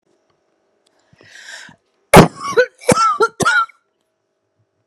{"cough_length": "4.9 s", "cough_amplitude": 32768, "cough_signal_mean_std_ratio": 0.33, "survey_phase": "alpha (2021-03-01 to 2021-08-12)", "age": "45-64", "gender": "Female", "wearing_mask": "No", "symptom_none": true, "smoker_status": "Never smoked", "respiratory_condition_asthma": false, "respiratory_condition_other": false, "recruitment_source": "REACT", "submission_delay": "3 days", "covid_test_result": "Negative", "covid_test_method": "RT-qPCR"}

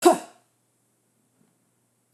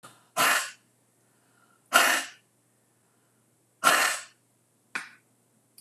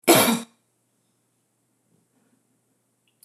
{"cough_length": "2.1 s", "cough_amplitude": 21890, "cough_signal_mean_std_ratio": 0.19, "exhalation_length": "5.8 s", "exhalation_amplitude": 19008, "exhalation_signal_mean_std_ratio": 0.33, "three_cough_length": "3.2 s", "three_cough_amplitude": 25908, "three_cough_signal_mean_std_ratio": 0.24, "survey_phase": "beta (2021-08-13 to 2022-03-07)", "age": "45-64", "gender": "Female", "wearing_mask": "No", "symptom_none": true, "smoker_status": "Never smoked", "respiratory_condition_asthma": false, "respiratory_condition_other": false, "recruitment_source": "REACT", "submission_delay": "1 day", "covid_test_result": "Negative", "covid_test_method": "RT-qPCR"}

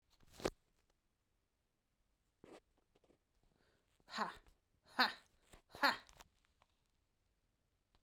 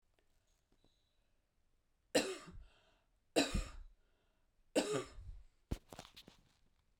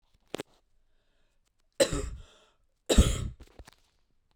{"exhalation_length": "8.0 s", "exhalation_amplitude": 4014, "exhalation_signal_mean_std_ratio": 0.2, "three_cough_length": "7.0 s", "three_cough_amplitude": 4007, "three_cough_signal_mean_std_ratio": 0.31, "cough_length": "4.4 s", "cough_amplitude": 15555, "cough_signal_mean_std_ratio": 0.27, "survey_phase": "alpha (2021-03-01 to 2021-08-12)", "age": "45-64", "gender": "Female", "wearing_mask": "No", "symptom_cough_any": true, "symptom_abdominal_pain": true, "symptom_fatigue": true, "symptom_fever_high_temperature": true, "symptom_change_to_sense_of_smell_or_taste": true, "symptom_loss_of_taste": true, "symptom_onset": "4 days", "smoker_status": "Never smoked", "respiratory_condition_asthma": false, "respiratory_condition_other": false, "recruitment_source": "Test and Trace", "submission_delay": "2 days", "covid_test_result": "Positive", "covid_test_method": "RT-qPCR", "covid_ct_value": 16.0, "covid_ct_gene": "ORF1ab gene", "covid_ct_mean": 16.6, "covid_viral_load": "3500000 copies/ml", "covid_viral_load_category": "High viral load (>1M copies/ml)"}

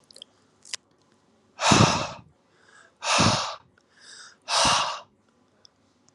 {"exhalation_length": "6.1 s", "exhalation_amplitude": 24500, "exhalation_signal_mean_std_ratio": 0.39, "survey_phase": "alpha (2021-03-01 to 2021-08-12)", "age": "18-44", "gender": "Male", "wearing_mask": "Yes", "symptom_none": true, "smoker_status": "Current smoker (1 to 10 cigarettes per day)", "respiratory_condition_asthma": false, "respiratory_condition_other": false, "recruitment_source": "Test and Trace", "submission_delay": "0 days", "covid_test_result": "Negative", "covid_test_method": "LFT"}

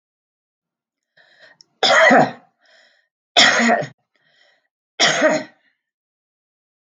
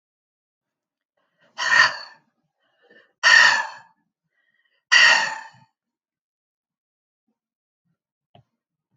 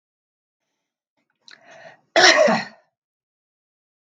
{"three_cough_length": "6.8 s", "three_cough_amplitude": 32766, "three_cough_signal_mean_std_ratio": 0.36, "exhalation_length": "9.0 s", "exhalation_amplitude": 27751, "exhalation_signal_mean_std_ratio": 0.28, "cough_length": "4.1 s", "cough_amplitude": 32766, "cough_signal_mean_std_ratio": 0.27, "survey_phase": "beta (2021-08-13 to 2022-03-07)", "age": "65+", "gender": "Female", "wearing_mask": "No", "symptom_none": true, "smoker_status": "Never smoked", "respiratory_condition_asthma": false, "respiratory_condition_other": false, "recruitment_source": "REACT", "submission_delay": "1 day", "covid_test_result": "Negative", "covid_test_method": "RT-qPCR", "influenza_a_test_result": "Negative", "influenza_b_test_result": "Negative"}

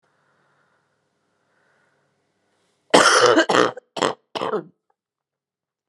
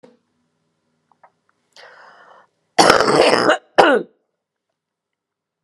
{"three_cough_length": "5.9 s", "three_cough_amplitude": 32768, "three_cough_signal_mean_std_ratio": 0.31, "cough_length": "5.6 s", "cough_amplitude": 32768, "cough_signal_mean_std_ratio": 0.32, "survey_phase": "beta (2021-08-13 to 2022-03-07)", "age": "45-64", "gender": "Female", "wearing_mask": "Yes", "symptom_cough_any": true, "symptom_runny_or_blocked_nose": true, "symptom_shortness_of_breath": true, "symptom_abdominal_pain": true, "symptom_fatigue": true, "symptom_fever_high_temperature": true, "symptom_headache": true, "symptom_onset": "4 days", "smoker_status": "Never smoked", "respiratory_condition_asthma": false, "respiratory_condition_other": false, "recruitment_source": "Test and Trace", "submission_delay": "1 day", "covid_test_result": "Positive", "covid_test_method": "RT-qPCR"}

